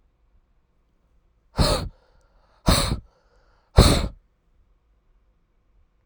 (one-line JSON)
{"exhalation_length": "6.1 s", "exhalation_amplitude": 32767, "exhalation_signal_mean_std_ratio": 0.28, "survey_phase": "alpha (2021-03-01 to 2021-08-12)", "age": "18-44", "gender": "Male", "wearing_mask": "No", "symptom_cough_any": true, "symptom_shortness_of_breath": true, "symptom_fatigue": true, "symptom_fever_high_temperature": true, "symptom_change_to_sense_of_smell_or_taste": true, "symptom_onset": "5 days", "smoker_status": "Ex-smoker", "respiratory_condition_asthma": true, "respiratory_condition_other": false, "recruitment_source": "Test and Trace", "submission_delay": "2 days", "covid_test_result": "Positive", "covid_test_method": "RT-qPCR", "covid_ct_value": 26.9, "covid_ct_gene": "N gene"}